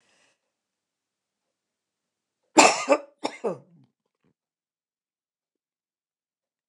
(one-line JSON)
{"cough_length": "6.7 s", "cough_amplitude": 29204, "cough_signal_mean_std_ratio": 0.18, "survey_phase": "alpha (2021-03-01 to 2021-08-12)", "age": "65+", "gender": "Female", "wearing_mask": "No", "symptom_none": true, "smoker_status": "Never smoked", "respiratory_condition_asthma": false, "respiratory_condition_other": false, "recruitment_source": "REACT", "submission_delay": "1 day", "covid_test_result": "Negative", "covid_test_method": "RT-qPCR"}